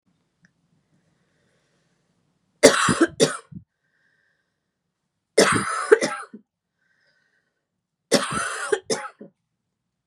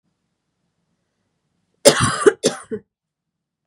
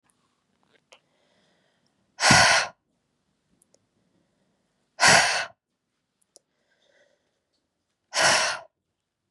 three_cough_length: 10.1 s
three_cough_amplitude: 32768
three_cough_signal_mean_std_ratio: 0.29
cough_length: 3.7 s
cough_amplitude: 32768
cough_signal_mean_std_ratio: 0.26
exhalation_length: 9.3 s
exhalation_amplitude: 24403
exhalation_signal_mean_std_ratio: 0.29
survey_phase: beta (2021-08-13 to 2022-03-07)
age: 18-44
gender: Female
wearing_mask: 'No'
symptom_cough_any: true
symptom_runny_or_blocked_nose: true
symptom_sore_throat: true
symptom_change_to_sense_of_smell_or_taste: true
symptom_loss_of_taste: true
symptom_onset: 3 days
smoker_status: Never smoked
respiratory_condition_asthma: false
respiratory_condition_other: false
recruitment_source: Test and Trace
submission_delay: 2 days
covid_test_result: Negative
covid_test_method: ePCR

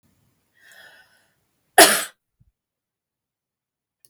cough_length: 4.1 s
cough_amplitude: 32768
cough_signal_mean_std_ratio: 0.17
survey_phase: beta (2021-08-13 to 2022-03-07)
age: 65+
gender: Female
wearing_mask: 'No'
symptom_none: true
smoker_status: Never smoked
respiratory_condition_asthma: false
respiratory_condition_other: false
recruitment_source: REACT
submission_delay: 2 days
covid_test_result: Negative
covid_test_method: RT-qPCR
influenza_a_test_result: Negative
influenza_b_test_result: Negative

